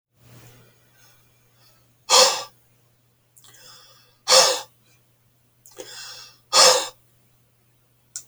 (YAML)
exhalation_length: 8.3 s
exhalation_amplitude: 29886
exhalation_signal_mean_std_ratio: 0.28
survey_phase: beta (2021-08-13 to 2022-03-07)
age: 65+
gender: Male
wearing_mask: 'No'
symptom_none: true
smoker_status: Never smoked
respiratory_condition_asthma: false
respiratory_condition_other: false
recruitment_source: REACT
submission_delay: 0 days
covid_test_result: Negative
covid_test_method: RT-qPCR